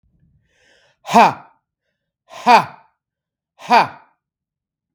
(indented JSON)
{
  "exhalation_length": "4.9 s",
  "exhalation_amplitude": 32766,
  "exhalation_signal_mean_std_ratio": 0.27,
  "survey_phase": "beta (2021-08-13 to 2022-03-07)",
  "age": "65+",
  "gender": "Male",
  "wearing_mask": "No",
  "symptom_cough_any": true,
  "symptom_runny_or_blocked_nose": true,
  "smoker_status": "Prefer not to say",
  "respiratory_condition_asthma": false,
  "respiratory_condition_other": false,
  "recruitment_source": "REACT",
  "submission_delay": "2 days",
  "covid_test_result": "Negative",
  "covid_test_method": "RT-qPCR"
}